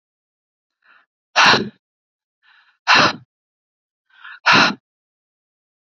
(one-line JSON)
{"exhalation_length": "5.8 s", "exhalation_amplitude": 31030, "exhalation_signal_mean_std_ratio": 0.3, "survey_phase": "beta (2021-08-13 to 2022-03-07)", "age": "45-64", "gender": "Female", "wearing_mask": "No", "symptom_none": true, "smoker_status": "Ex-smoker", "respiratory_condition_asthma": false, "respiratory_condition_other": false, "recruitment_source": "REACT", "submission_delay": "2 days", "covid_test_result": "Negative", "covid_test_method": "RT-qPCR", "influenza_a_test_result": "Negative", "influenza_b_test_result": "Negative"}